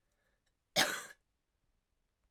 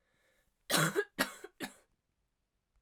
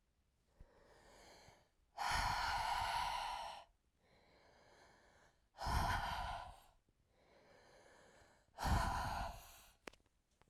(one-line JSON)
{"cough_length": "2.3 s", "cough_amplitude": 5230, "cough_signal_mean_std_ratio": 0.24, "three_cough_length": "2.8 s", "three_cough_amplitude": 6039, "three_cough_signal_mean_std_ratio": 0.33, "exhalation_length": "10.5 s", "exhalation_amplitude": 1981, "exhalation_signal_mean_std_ratio": 0.51, "survey_phase": "alpha (2021-03-01 to 2021-08-12)", "age": "18-44", "gender": "Female", "wearing_mask": "No", "symptom_cough_any": true, "symptom_new_continuous_cough": true, "symptom_fatigue": true, "symptom_headache": true, "symptom_change_to_sense_of_smell_or_taste": true, "symptom_onset": "5 days", "smoker_status": "Never smoked", "respiratory_condition_asthma": false, "respiratory_condition_other": false, "recruitment_source": "Test and Trace", "submission_delay": "2 days", "covid_test_result": "Positive", "covid_test_method": "RT-qPCR", "covid_ct_value": 26.9, "covid_ct_gene": "ORF1ab gene", "covid_ct_mean": 27.2, "covid_viral_load": "1200 copies/ml", "covid_viral_load_category": "Minimal viral load (< 10K copies/ml)"}